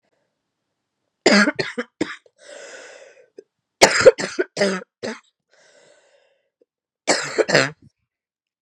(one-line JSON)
{"three_cough_length": "8.6 s", "three_cough_amplitude": 32768, "three_cough_signal_mean_std_ratio": 0.3, "survey_phase": "beta (2021-08-13 to 2022-03-07)", "age": "18-44", "gender": "Female", "wearing_mask": "No", "symptom_cough_any": true, "symptom_new_continuous_cough": true, "symptom_runny_or_blocked_nose": true, "symptom_onset": "6 days", "smoker_status": "Never smoked", "respiratory_condition_asthma": false, "respiratory_condition_other": false, "recruitment_source": "Test and Trace", "submission_delay": "2 days", "covid_test_result": "Positive", "covid_test_method": "RT-qPCR", "covid_ct_value": 25.2, "covid_ct_gene": "ORF1ab gene", "covid_ct_mean": 25.6, "covid_viral_load": "4000 copies/ml", "covid_viral_load_category": "Minimal viral load (< 10K copies/ml)"}